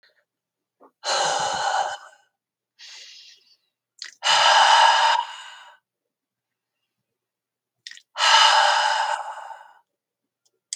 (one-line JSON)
{"exhalation_length": "10.8 s", "exhalation_amplitude": 24097, "exhalation_signal_mean_std_ratio": 0.44, "survey_phase": "beta (2021-08-13 to 2022-03-07)", "age": "65+", "gender": "Female", "wearing_mask": "No", "symptom_none": true, "smoker_status": "Ex-smoker", "respiratory_condition_asthma": false, "respiratory_condition_other": false, "recruitment_source": "REACT", "submission_delay": "2 days", "covid_test_result": "Negative", "covid_test_method": "RT-qPCR", "influenza_a_test_result": "Negative", "influenza_b_test_result": "Negative"}